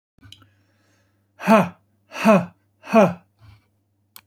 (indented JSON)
{
  "exhalation_length": "4.3 s",
  "exhalation_amplitude": 26581,
  "exhalation_signal_mean_std_ratio": 0.3,
  "survey_phase": "beta (2021-08-13 to 2022-03-07)",
  "age": "45-64",
  "gender": "Male",
  "wearing_mask": "No",
  "symptom_none": true,
  "smoker_status": "Ex-smoker",
  "respiratory_condition_asthma": false,
  "respiratory_condition_other": false,
  "recruitment_source": "REACT",
  "submission_delay": "2 days",
  "covid_test_result": "Negative",
  "covid_test_method": "RT-qPCR",
  "influenza_a_test_result": "Negative",
  "influenza_b_test_result": "Negative"
}